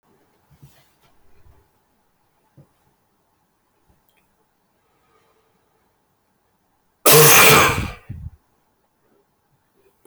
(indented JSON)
{
  "cough_length": "10.1 s",
  "cough_amplitude": 27855,
  "cough_signal_mean_std_ratio": 0.25,
  "survey_phase": "beta (2021-08-13 to 2022-03-07)",
  "age": "18-44",
  "gender": "Male",
  "wearing_mask": "No",
  "symptom_cough_any": true,
  "symptom_new_continuous_cough": true,
  "symptom_runny_or_blocked_nose": true,
  "symptom_shortness_of_breath": true,
  "symptom_sore_throat": true,
  "symptom_fatigue": true,
  "symptom_fever_high_temperature": true,
  "symptom_headache": true,
  "symptom_change_to_sense_of_smell_or_taste": true,
  "symptom_onset": "4 days",
  "smoker_status": "Never smoked",
  "respiratory_condition_asthma": true,
  "respiratory_condition_other": false,
  "recruitment_source": "Test and Trace",
  "submission_delay": "1 day",
  "covid_test_result": "Positive",
  "covid_test_method": "RT-qPCR"
}